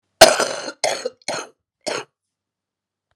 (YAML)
cough_length: 3.2 s
cough_amplitude: 32768
cough_signal_mean_std_ratio: 0.29
survey_phase: beta (2021-08-13 to 2022-03-07)
age: 45-64
gender: Female
wearing_mask: 'No'
symptom_cough_any: true
symptom_runny_or_blocked_nose: true
symptom_abdominal_pain: true
symptom_diarrhoea: true
symptom_fatigue: true
symptom_headache: true
symptom_loss_of_taste: true
symptom_onset: 3 days
smoker_status: Ex-smoker
respiratory_condition_asthma: false
respiratory_condition_other: false
recruitment_source: Test and Trace
submission_delay: 2 days
covid_test_result: Positive
covid_test_method: RT-qPCR
covid_ct_value: 14.9
covid_ct_gene: ORF1ab gene
covid_ct_mean: 15.2
covid_viral_load: 11000000 copies/ml
covid_viral_load_category: High viral load (>1M copies/ml)